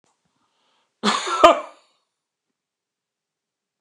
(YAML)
cough_length: 3.8 s
cough_amplitude: 29204
cough_signal_mean_std_ratio: 0.23
survey_phase: beta (2021-08-13 to 2022-03-07)
age: 45-64
gender: Male
wearing_mask: 'No'
symptom_none: true
smoker_status: Never smoked
respiratory_condition_asthma: false
respiratory_condition_other: false
recruitment_source: REACT
submission_delay: 6 days
covid_test_result: Negative
covid_test_method: RT-qPCR